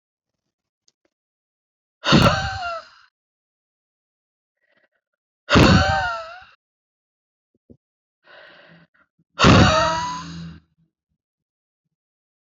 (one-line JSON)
{"exhalation_length": "12.5 s", "exhalation_amplitude": 28012, "exhalation_signal_mean_std_ratio": 0.31, "survey_phase": "alpha (2021-03-01 to 2021-08-12)", "age": "45-64", "gender": "Female", "wearing_mask": "No", "symptom_none": true, "smoker_status": "Ex-smoker", "respiratory_condition_asthma": false, "respiratory_condition_other": false, "recruitment_source": "REACT", "submission_delay": "1 day", "covid_test_result": "Negative", "covid_test_method": "RT-qPCR"}